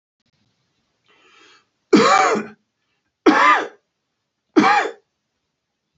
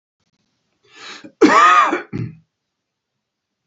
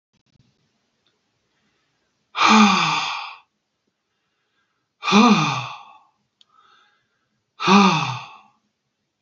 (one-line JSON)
{"three_cough_length": "6.0 s", "three_cough_amplitude": 30086, "three_cough_signal_mean_std_ratio": 0.37, "cough_length": "3.7 s", "cough_amplitude": 28470, "cough_signal_mean_std_ratio": 0.36, "exhalation_length": "9.2 s", "exhalation_amplitude": 27506, "exhalation_signal_mean_std_ratio": 0.35, "survey_phase": "alpha (2021-03-01 to 2021-08-12)", "age": "65+", "gender": "Male", "wearing_mask": "No", "symptom_none": true, "smoker_status": "Ex-smoker", "respiratory_condition_asthma": false, "respiratory_condition_other": false, "recruitment_source": "REACT", "submission_delay": "1 day", "covid_test_result": "Negative", "covid_test_method": "RT-qPCR"}